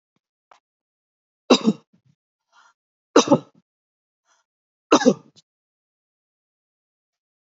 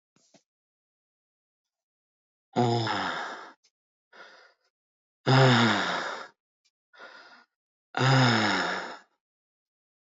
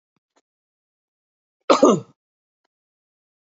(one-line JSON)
{"three_cough_length": "7.4 s", "three_cough_amplitude": 28438, "three_cough_signal_mean_std_ratio": 0.2, "exhalation_length": "10.1 s", "exhalation_amplitude": 14391, "exhalation_signal_mean_std_ratio": 0.39, "cough_length": "3.5 s", "cough_amplitude": 27074, "cough_signal_mean_std_ratio": 0.21, "survey_phase": "beta (2021-08-13 to 2022-03-07)", "age": "45-64", "gender": "Male", "wearing_mask": "No", "symptom_none": true, "smoker_status": "Ex-smoker", "respiratory_condition_asthma": false, "respiratory_condition_other": false, "recruitment_source": "REACT", "submission_delay": "2 days", "covid_test_result": "Negative", "covid_test_method": "RT-qPCR"}